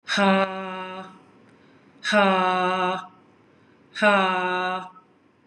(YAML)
exhalation_length: 5.5 s
exhalation_amplitude: 19024
exhalation_signal_mean_std_ratio: 0.55
survey_phase: beta (2021-08-13 to 2022-03-07)
age: 45-64
gender: Female
wearing_mask: 'No'
symptom_none: true
smoker_status: Ex-smoker
respiratory_condition_asthma: false
respiratory_condition_other: false
recruitment_source: REACT
submission_delay: 1 day
covid_test_result: Negative
covid_test_method: RT-qPCR
influenza_a_test_result: Negative
influenza_b_test_result: Negative